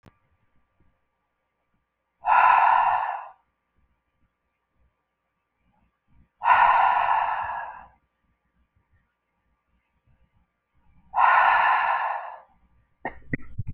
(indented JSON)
{
  "exhalation_length": "13.7 s",
  "exhalation_amplitude": 18063,
  "exhalation_signal_mean_std_ratio": 0.4,
  "survey_phase": "beta (2021-08-13 to 2022-03-07)",
  "age": "45-64",
  "gender": "Female",
  "wearing_mask": "No",
  "symptom_cough_any": true,
  "symptom_runny_or_blocked_nose": true,
  "symptom_fatigue": true,
  "symptom_headache": true,
  "smoker_status": "Never smoked",
  "respiratory_condition_asthma": false,
  "respiratory_condition_other": false,
  "recruitment_source": "Test and Trace",
  "submission_delay": "2 days",
  "covid_test_result": "Positive",
  "covid_test_method": "RT-qPCR",
  "covid_ct_value": 16.3,
  "covid_ct_gene": "ORF1ab gene",
  "covid_ct_mean": 16.8,
  "covid_viral_load": "3100000 copies/ml",
  "covid_viral_load_category": "High viral load (>1M copies/ml)"
}